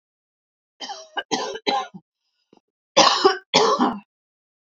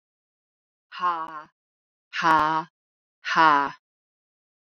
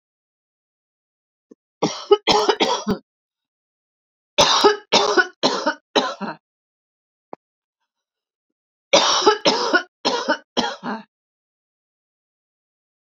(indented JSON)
{
  "cough_length": "4.8 s",
  "cough_amplitude": 30135,
  "cough_signal_mean_std_ratio": 0.39,
  "exhalation_length": "4.8 s",
  "exhalation_amplitude": 21609,
  "exhalation_signal_mean_std_ratio": 0.36,
  "three_cough_length": "13.1 s",
  "three_cough_amplitude": 31021,
  "three_cough_signal_mean_std_ratio": 0.38,
  "survey_phase": "beta (2021-08-13 to 2022-03-07)",
  "age": "45-64",
  "gender": "Female",
  "wearing_mask": "No",
  "symptom_cough_any": true,
  "symptom_runny_or_blocked_nose": true,
  "symptom_change_to_sense_of_smell_or_taste": true,
  "symptom_onset": "3 days",
  "smoker_status": "Never smoked",
  "respiratory_condition_asthma": false,
  "respiratory_condition_other": false,
  "recruitment_source": "Test and Trace",
  "submission_delay": "2 days",
  "covid_test_result": "Positive",
  "covid_test_method": "ePCR"
}